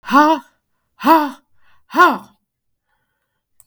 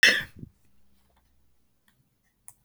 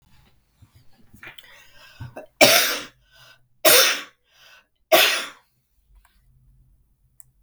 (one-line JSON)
{"exhalation_length": "3.7 s", "exhalation_amplitude": 32768, "exhalation_signal_mean_std_ratio": 0.36, "cough_length": "2.6 s", "cough_amplitude": 22944, "cough_signal_mean_std_ratio": 0.21, "three_cough_length": "7.4 s", "three_cough_amplitude": 32768, "three_cough_signal_mean_std_ratio": 0.3, "survey_phase": "beta (2021-08-13 to 2022-03-07)", "age": "45-64", "gender": "Female", "wearing_mask": "No", "symptom_cough_any": true, "symptom_new_continuous_cough": true, "symptom_runny_or_blocked_nose": true, "symptom_headache": true, "symptom_change_to_sense_of_smell_or_taste": true, "symptom_onset": "2 days", "smoker_status": "Never smoked", "respiratory_condition_asthma": false, "respiratory_condition_other": false, "recruitment_source": "Test and Trace", "submission_delay": "1 day", "covid_test_result": "Positive", "covid_test_method": "ePCR"}